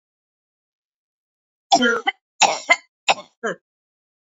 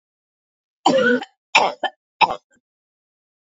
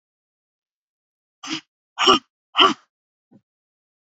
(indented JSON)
{
  "three_cough_length": "4.3 s",
  "three_cough_amplitude": 32733,
  "three_cough_signal_mean_std_ratio": 0.3,
  "cough_length": "3.4 s",
  "cough_amplitude": 28272,
  "cough_signal_mean_std_ratio": 0.35,
  "exhalation_length": "4.1 s",
  "exhalation_amplitude": 28592,
  "exhalation_signal_mean_std_ratio": 0.24,
  "survey_phase": "beta (2021-08-13 to 2022-03-07)",
  "age": "18-44",
  "gender": "Female",
  "wearing_mask": "No",
  "symptom_none": true,
  "symptom_onset": "6 days",
  "smoker_status": "Never smoked",
  "respiratory_condition_asthma": false,
  "respiratory_condition_other": false,
  "recruitment_source": "REACT",
  "submission_delay": "1 day",
  "covid_test_result": "Negative",
  "covid_test_method": "RT-qPCR",
  "influenza_a_test_result": "Negative",
  "influenza_b_test_result": "Negative"
}